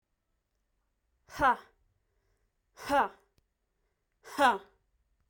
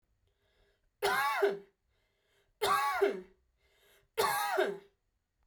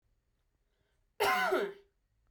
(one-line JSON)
{"exhalation_length": "5.3 s", "exhalation_amplitude": 7625, "exhalation_signal_mean_std_ratio": 0.27, "three_cough_length": "5.5 s", "three_cough_amplitude": 4688, "three_cough_signal_mean_std_ratio": 0.48, "cough_length": "2.3 s", "cough_amplitude": 4003, "cough_signal_mean_std_ratio": 0.41, "survey_phase": "beta (2021-08-13 to 2022-03-07)", "age": "18-44", "gender": "Female", "wearing_mask": "No", "symptom_none": true, "smoker_status": "Never smoked", "respiratory_condition_asthma": false, "respiratory_condition_other": false, "recruitment_source": "REACT", "submission_delay": "0 days", "covid_test_result": "Negative", "covid_test_method": "RT-qPCR"}